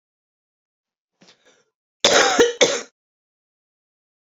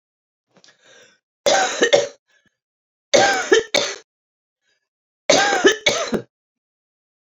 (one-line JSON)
{"cough_length": "4.3 s", "cough_amplitude": 32739, "cough_signal_mean_std_ratio": 0.3, "three_cough_length": "7.3 s", "three_cough_amplitude": 29744, "three_cough_signal_mean_std_ratio": 0.4, "survey_phase": "alpha (2021-03-01 to 2021-08-12)", "age": "45-64", "gender": "Female", "wearing_mask": "No", "symptom_cough_any": true, "symptom_change_to_sense_of_smell_or_taste": true, "symptom_loss_of_taste": true, "smoker_status": "Current smoker (1 to 10 cigarettes per day)", "recruitment_source": "Test and Trace", "submission_delay": "0 days", "covid_test_result": "Positive", "covid_test_method": "LFT"}